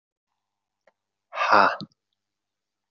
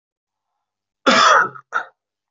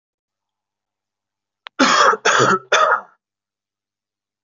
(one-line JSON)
{"exhalation_length": "2.9 s", "exhalation_amplitude": 24515, "exhalation_signal_mean_std_ratio": 0.26, "cough_length": "2.3 s", "cough_amplitude": 26998, "cough_signal_mean_std_ratio": 0.38, "three_cough_length": "4.4 s", "three_cough_amplitude": 31748, "three_cough_signal_mean_std_ratio": 0.39, "survey_phase": "beta (2021-08-13 to 2022-03-07)", "age": "18-44", "gender": "Male", "wearing_mask": "No", "symptom_cough_any": true, "symptom_runny_or_blocked_nose": true, "symptom_fatigue": true, "symptom_onset": "3 days", "smoker_status": "Never smoked", "respiratory_condition_asthma": false, "respiratory_condition_other": false, "recruitment_source": "Test and Trace", "submission_delay": "2 days", "covid_test_result": "Positive", "covid_test_method": "RT-qPCR", "covid_ct_value": 22.9, "covid_ct_gene": "S gene", "covid_ct_mean": 23.7, "covid_viral_load": "17000 copies/ml", "covid_viral_load_category": "Low viral load (10K-1M copies/ml)"}